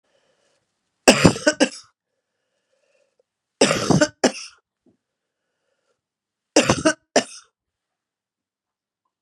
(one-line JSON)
{"three_cough_length": "9.2 s", "three_cough_amplitude": 32768, "three_cough_signal_mean_std_ratio": 0.27, "survey_phase": "beta (2021-08-13 to 2022-03-07)", "age": "65+", "gender": "Female", "wearing_mask": "No", "symptom_cough_any": true, "symptom_runny_or_blocked_nose": true, "symptom_fatigue": true, "symptom_loss_of_taste": true, "symptom_onset": "2 days", "smoker_status": "Never smoked", "respiratory_condition_asthma": false, "respiratory_condition_other": false, "recruitment_source": "Test and Trace", "submission_delay": "1 day", "covid_test_result": "Positive", "covid_test_method": "RT-qPCR"}